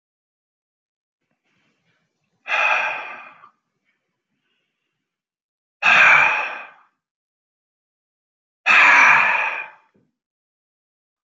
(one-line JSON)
{"exhalation_length": "11.3 s", "exhalation_amplitude": 27970, "exhalation_signal_mean_std_ratio": 0.34, "survey_phase": "alpha (2021-03-01 to 2021-08-12)", "age": "45-64", "gender": "Male", "wearing_mask": "No", "symptom_cough_any": true, "smoker_status": "Ex-smoker", "respiratory_condition_asthma": false, "respiratory_condition_other": false, "recruitment_source": "REACT", "submission_delay": "4 days", "covid_test_result": "Negative", "covid_test_method": "RT-qPCR"}